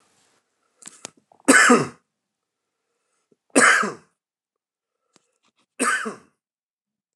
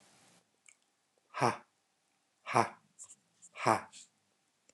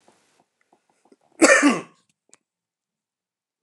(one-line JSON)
{"three_cough_length": "7.2 s", "three_cough_amplitude": 29043, "three_cough_signal_mean_std_ratio": 0.28, "exhalation_length": "4.7 s", "exhalation_amplitude": 8654, "exhalation_signal_mean_std_ratio": 0.24, "cough_length": "3.6 s", "cough_amplitude": 28896, "cough_signal_mean_std_ratio": 0.25, "survey_phase": "beta (2021-08-13 to 2022-03-07)", "age": "45-64", "gender": "Male", "wearing_mask": "No", "symptom_none": true, "smoker_status": "Never smoked", "respiratory_condition_asthma": false, "respiratory_condition_other": false, "recruitment_source": "REACT", "submission_delay": "1 day", "covid_test_result": "Negative", "covid_test_method": "RT-qPCR"}